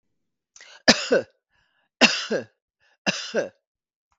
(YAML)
three_cough_length: 4.2 s
three_cough_amplitude: 32768
three_cough_signal_mean_std_ratio: 0.31
survey_phase: beta (2021-08-13 to 2022-03-07)
age: 65+
gender: Female
wearing_mask: 'No'
symptom_none: true
smoker_status: Ex-smoker
respiratory_condition_asthma: false
respiratory_condition_other: false
recruitment_source: REACT
submission_delay: 1 day
covid_test_result: Negative
covid_test_method: RT-qPCR
influenza_a_test_result: Negative
influenza_b_test_result: Negative